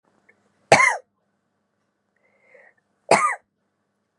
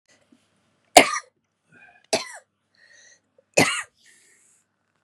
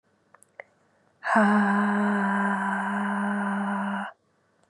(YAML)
cough_length: 4.2 s
cough_amplitude: 32768
cough_signal_mean_std_ratio: 0.25
three_cough_length: 5.0 s
three_cough_amplitude: 32768
three_cough_signal_mean_std_ratio: 0.2
exhalation_length: 4.7 s
exhalation_amplitude: 12844
exhalation_signal_mean_std_ratio: 0.75
survey_phase: beta (2021-08-13 to 2022-03-07)
age: 45-64
gender: Female
wearing_mask: 'No'
symptom_none: true
smoker_status: Never smoked
respiratory_condition_asthma: true
respiratory_condition_other: false
recruitment_source: REACT
submission_delay: 1 day
covid_test_result: Negative
covid_test_method: RT-qPCR
influenza_a_test_result: Negative
influenza_b_test_result: Negative